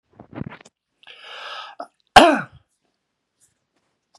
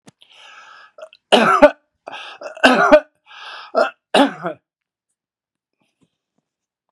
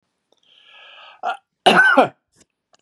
exhalation_length: 4.2 s
exhalation_amplitude: 32768
exhalation_signal_mean_std_ratio: 0.21
three_cough_length: 6.9 s
three_cough_amplitude: 32768
three_cough_signal_mean_std_ratio: 0.32
cough_length: 2.8 s
cough_amplitude: 32361
cough_signal_mean_std_ratio: 0.35
survey_phase: beta (2021-08-13 to 2022-03-07)
age: 65+
gender: Male
wearing_mask: 'Yes'
symptom_cough_any: true
symptom_runny_or_blocked_nose: true
smoker_status: Never smoked
respiratory_condition_asthma: false
respiratory_condition_other: false
recruitment_source: Test and Trace
submission_delay: 2 days
covid_test_result: Positive
covid_test_method: RT-qPCR
covid_ct_value: 20.1
covid_ct_gene: ORF1ab gene
covid_ct_mean: 20.4
covid_viral_load: 200000 copies/ml
covid_viral_load_category: Low viral load (10K-1M copies/ml)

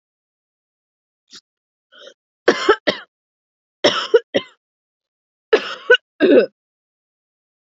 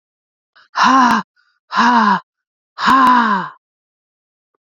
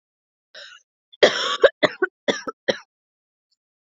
three_cough_length: 7.8 s
three_cough_amplitude: 29026
three_cough_signal_mean_std_ratio: 0.28
exhalation_length: 4.6 s
exhalation_amplitude: 29861
exhalation_signal_mean_std_ratio: 0.51
cough_length: 3.9 s
cough_amplitude: 30344
cough_signal_mean_std_ratio: 0.28
survey_phase: beta (2021-08-13 to 2022-03-07)
age: 18-44
gender: Female
wearing_mask: 'No'
symptom_cough_any: true
symptom_runny_or_blocked_nose: true
symptom_shortness_of_breath: true
symptom_fatigue: true
symptom_onset: 3 days
smoker_status: Ex-smoker
respiratory_condition_asthma: false
respiratory_condition_other: false
recruitment_source: Test and Trace
submission_delay: 1 day
covid_test_result: Positive
covid_test_method: RT-qPCR
covid_ct_value: 18.1
covid_ct_gene: ORF1ab gene
covid_ct_mean: 19.3
covid_viral_load: 470000 copies/ml
covid_viral_load_category: Low viral load (10K-1M copies/ml)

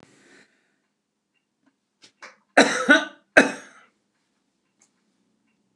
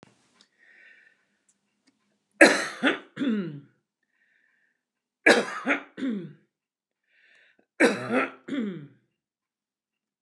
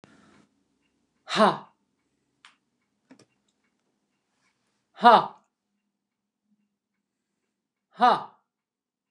cough_length: 5.8 s
cough_amplitude: 29203
cough_signal_mean_std_ratio: 0.22
three_cough_length: 10.2 s
three_cough_amplitude: 28717
three_cough_signal_mean_std_ratio: 0.31
exhalation_length: 9.1 s
exhalation_amplitude: 24445
exhalation_signal_mean_std_ratio: 0.2
survey_phase: beta (2021-08-13 to 2022-03-07)
age: 65+
gender: Female
wearing_mask: 'No'
symptom_none: true
smoker_status: Ex-smoker
respiratory_condition_asthma: false
respiratory_condition_other: false
recruitment_source: REACT
submission_delay: 2 days
covid_test_result: Negative
covid_test_method: RT-qPCR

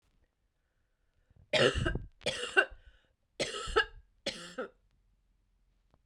three_cough_length: 6.1 s
three_cough_amplitude: 10640
three_cough_signal_mean_std_ratio: 0.34
survey_phase: beta (2021-08-13 to 2022-03-07)
age: 18-44
gender: Female
wearing_mask: 'No'
symptom_cough_any: true
symptom_runny_or_blocked_nose: true
symptom_shortness_of_breath: true
symptom_sore_throat: true
symptom_fatigue: true
symptom_headache: true
symptom_onset: 12 days
smoker_status: Never smoked
respiratory_condition_asthma: false
respiratory_condition_other: false
recruitment_source: REACT
submission_delay: 3 days
covid_test_result: Negative
covid_test_method: RT-qPCR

